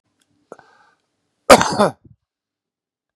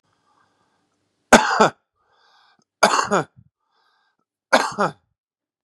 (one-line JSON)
{"cough_length": "3.2 s", "cough_amplitude": 32768, "cough_signal_mean_std_ratio": 0.22, "three_cough_length": "5.6 s", "three_cough_amplitude": 32768, "three_cough_signal_mean_std_ratio": 0.28, "survey_phase": "beta (2021-08-13 to 2022-03-07)", "age": "45-64", "gender": "Male", "wearing_mask": "No", "symptom_cough_any": true, "symptom_onset": "9 days", "smoker_status": "Current smoker (11 or more cigarettes per day)", "respiratory_condition_asthma": false, "respiratory_condition_other": false, "recruitment_source": "REACT", "submission_delay": "1 day", "covid_test_result": "Negative", "covid_test_method": "RT-qPCR", "influenza_a_test_result": "Unknown/Void", "influenza_b_test_result": "Unknown/Void"}